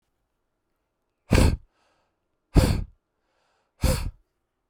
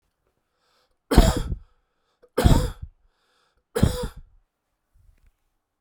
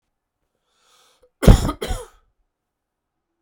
{"exhalation_length": "4.7 s", "exhalation_amplitude": 19171, "exhalation_signal_mean_std_ratio": 0.3, "three_cough_length": "5.8 s", "three_cough_amplitude": 32768, "three_cough_signal_mean_std_ratio": 0.29, "cough_length": "3.4 s", "cough_amplitude": 32768, "cough_signal_mean_std_ratio": 0.21, "survey_phase": "beta (2021-08-13 to 2022-03-07)", "age": "18-44", "gender": "Male", "wearing_mask": "No", "symptom_change_to_sense_of_smell_or_taste": true, "symptom_onset": "8 days", "smoker_status": "Never smoked", "respiratory_condition_asthma": false, "respiratory_condition_other": false, "recruitment_source": "Test and Trace", "submission_delay": "2 days", "covid_test_result": "Positive", "covid_test_method": "RT-qPCR", "covid_ct_value": 22.5, "covid_ct_gene": "ORF1ab gene", "covid_ct_mean": 22.7, "covid_viral_load": "35000 copies/ml", "covid_viral_load_category": "Low viral load (10K-1M copies/ml)"}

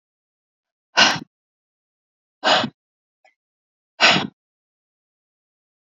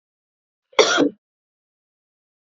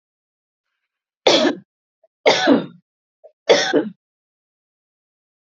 {"exhalation_length": "5.9 s", "exhalation_amplitude": 31599, "exhalation_signal_mean_std_ratio": 0.26, "cough_length": "2.6 s", "cough_amplitude": 32767, "cough_signal_mean_std_ratio": 0.26, "three_cough_length": "5.5 s", "three_cough_amplitude": 30358, "three_cough_signal_mean_std_ratio": 0.33, "survey_phase": "beta (2021-08-13 to 2022-03-07)", "age": "45-64", "gender": "Female", "wearing_mask": "No", "symptom_none": true, "smoker_status": "Never smoked", "respiratory_condition_asthma": false, "respiratory_condition_other": false, "recruitment_source": "REACT", "submission_delay": "2 days", "covid_test_result": "Negative", "covid_test_method": "RT-qPCR", "influenza_a_test_result": "Negative", "influenza_b_test_result": "Negative"}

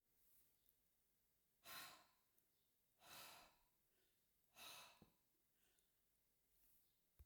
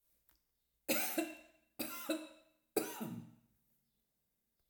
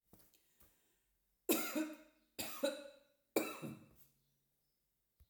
{"exhalation_length": "7.3 s", "exhalation_amplitude": 169, "exhalation_signal_mean_std_ratio": 0.47, "cough_length": "4.7 s", "cough_amplitude": 3609, "cough_signal_mean_std_ratio": 0.4, "three_cough_length": "5.3 s", "three_cough_amplitude": 3277, "three_cough_signal_mean_std_ratio": 0.35, "survey_phase": "alpha (2021-03-01 to 2021-08-12)", "age": "65+", "gender": "Female", "wearing_mask": "No", "symptom_none": true, "smoker_status": "Never smoked", "respiratory_condition_asthma": false, "respiratory_condition_other": false, "recruitment_source": "REACT", "submission_delay": "1 day", "covid_test_result": "Negative", "covid_test_method": "RT-qPCR"}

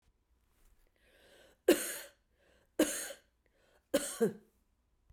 {"three_cough_length": "5.1 s", "three_cough_amplitude": 6894, "three_cough_signal_mean_std_ratio": 0.28, "survey_phase": "beta (2021-08-13 to 2022-03-07)", "age": "65+", "gender": "Female", "wearing_mask": "No", "symptom_cough_any": true, "symptom_runny_or_blocked_nose": true, "symptom_fatigue": true, "symptom_onset": "3 days", "smoker_status": "Ex-smoker", "respiratory_condition_asthma": false, "respiratory_condition_other": false, "recruitment_source": "Test and Trace", "submission_delay": "2 days", "covid_test_result": "Positive", "covid_test_method": "RT-qPCR", "covid_ct_value": 20.0, "covid_ct_gene": "ORF1ab gene", "covid_ct_mean": 20.2, "covid_viral_load": "230000 copies/ml", "covid_viral_load_category": "Low viral load (10K-1M copies/ml)"}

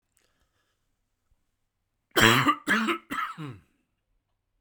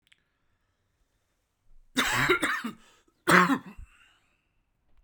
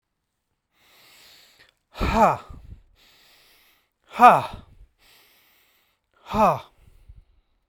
{"cough_length": "4.6 s", "cough_amplitude": 25202, "cough_signal_mean_std_ratio": 0.33, "three_cough_length": "5.0 s", "three_cough_amplitude": 24797, "three_cough_signal_mean_std_ratio": 0.34, "exhalation_length": "7.7 s", "exhalation_amplitude": 32767, "exhalation_signal_mean_std_ratio": 0.26, "survey_phase": "alpha (2021-03-01 to 2021-08-12)", "age": "45-64", "gender": "Male", "wearing_mask": "No", "symptom_none": true, "smoker_status": "Never smoked", "respiratory_condition_asthma": false, "respiratory_condition_other": false, "recruitment_source": "REACT", "submission_delay": "7 days", "covid_test_result": "Negative", "covid_test_method": "RT-qPCR"}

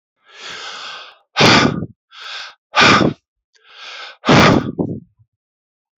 {"exhalation_length": "6.0 s", "exhalation_amplitude": 32768, "exhalation_signal_mean_std_ratio": 0.43, "survey_phase": "beta (2021-08-13 to 2022-03-07)", "age": "65+", "gender": "Male", "wearing_mask": "No", "symptom_none": true, "smoker_status": "Ex-smoker", "respiratory_condition_asthma": false, "respiratory_condition_other": false, "recruitment_source": "REACT", "submission_delay": "2 days", "covid_test_result": "Negative", "covid_test_method": "RT-qPCR", "influenza_a_test_result": "Unknown/Void", "influenza_b_test_result": "Unknown/Void"}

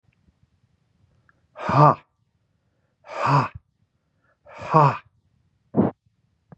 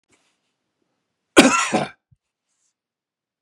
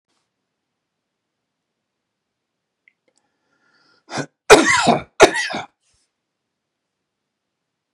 {"exhalation_length": "6.6 s", "exhalation_amplitude": 29240, "exhalation_signal_mean_std_ratio": 0.3, "cough_length": "3.4 s", "cough_amplitude": 32768, "cough_signal_mean_std_ratio": 0.24, "three_cough_length": "7.9 s", "three_cough_amplitude": 32768, "three_cough_signal_mean_std_ratio": 0.22, "survey_phase": "beta (2021-08-13 to 2022-03-07)", "age": "65+", "gender": "Male", "wearing_mask": "No", "symptom_runny_or_blocked_nose": true, "symptom_abdominal_pain": true, "symptom_fatigue": true, "symptom_onset": "12 days", "smoker_status": "Ex-smoker", "respiratory_condition_asthma": false, "respiratory_condition_other": false, "recruitment_source": "REACT", "submission_delay": "2 days", "covid_test_result": "Negative", "covid_test_method": "RT-qPCR"}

